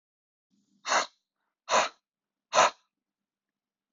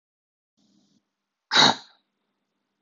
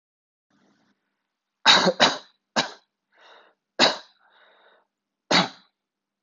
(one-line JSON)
{"exhalation_length": "3.9 s", "exhalation_amplitude": 13881, "exhalation_signal_mean_std_ratio": 0.28, "cough_length": "2.8 s", "cough_amplitude": 23629, "cough_signal_mean_std_ratio": 0.22, "three_cough_length": "6.2 s", "three_cough_amplitude": 25258, "three_cough_signal_mean_std_ratio": 0.28, "survey_phase": "beta (2021-08-13 to 2022-03-07)", "age": "18-44", "gender": "Male", "wearing_mask": "No", "symptom_runny_or_blocked_nose": true, "symptom_onset": "3 days", "smoker_status": "Never smoked", "respiratory_condition_asthma": false, "respiratory_condition_other": false, "recruitment_source": "Test and Trace", "submission_delay": "2 days", "covid_test_result": "Positive", "covid_test_method": "RT-qPCR", "covid_ct_value": 13.9, "covid_ct_gene": "N gene"}